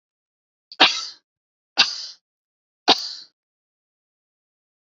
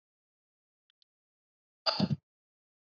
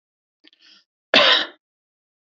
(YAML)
three_cough_length: 4.9 s
three_cough_amplitude: 31687
three_cough_signal_mean_std_ratio: 0.23
exhalation_length: 2.8 s
exhalation_amplitude: 6683
exhalation_signal_mean_std_ratio: 0.22
cough_length: 2.2 s
cough_amplitude: 30169
cough_signal_mean_std_ratio: 0.3
survey_phase: beta (2021-08-13 to 2022-03-07)
age: 18-44
gender: Female
wearing_mask: 'No'
symptom_none: true
smoker_status: Ex-smoker
respiratory_condition_asthma: false
respiratory_condition_other: false
recruitment_source: REACT
submission_delay: 1 day
covid_test_result: Negative
covid_test_method: RT-qPCR
influenza_a_test_result: Negative
influenza_b_test_result: Negative